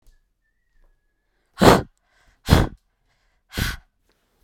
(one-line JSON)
{"exhalation_length": "4.4 s", "exhalation_amplitude": 32768, "exhalation_signal_mean_std_ratio": 0.25, "survey_phase": "beta (2021-08-13 to 2022-03-07)", "age": "18-44", "gender": "Female", "wearing_mask": "No", "symptom_other": true, "smoker_status": "Never smoked", "respiratory_condition_asthma": false, "respiratory_condition_other": false, "recruitment_source": "REACT", "submission_delay": "6 days", "covid_test_result": "Negative", "covid_test_method": "RT-qPCR", "influenza_a_test_result": "Negative", "influenza_b_test_result": "Negative"}